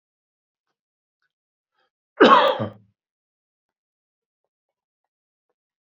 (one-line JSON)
{"cough_length": "5.8 s", "cough_amplitude": 30016, "cough_signal_mean_std_ratio": 0.2, "survey_phase": "beta (2021-08-13 to 2022-03-07)", "age": "45-64", "gender": "Male", "wearing_mask": "No", "symptom_cough_any": true, "symptom_runny_or_blocked_nose": true, "symptom_sore_throat": true, "symptom_fatigue": true, "symptom_headache": true, "symptom_other": true, "smoker_status": "Never smoked", "respiratory_condition_asthma": false, "respiratory_condition_other": false, "recruitment_source": "Test and Trace", "submission_delay": "1 day", "covid_test_result": "Positive", "covid_test_method": "RT-qPCR", "covid_ct_value": 21.1, "covid_ct_gene": "ORF1ab gene", "covid_ct_mean": 21.4, "covid_viral_load": "96000 copies/ml", "covid_viral_load_category": "Low viral load (10K-1M copies/ml)"}